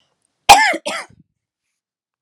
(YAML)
cough_length: 2.2 s
cough_amplitude: 32768
cough_signal_mean_std_ratio: 0.28
survey_phase: beta (2021-08-13 to 2022-03-07)
age: 18-44
gender: Female
wearing_mask: 'No'
symptom_none: true
smoker_status: Never smoked
respiratory_condition_asthma: false
respiratory_condition_other: false
recruitment_source: REACT
submission_delay: 1 day
covid_test_result: Negative
covid_test_method: RT-qPCR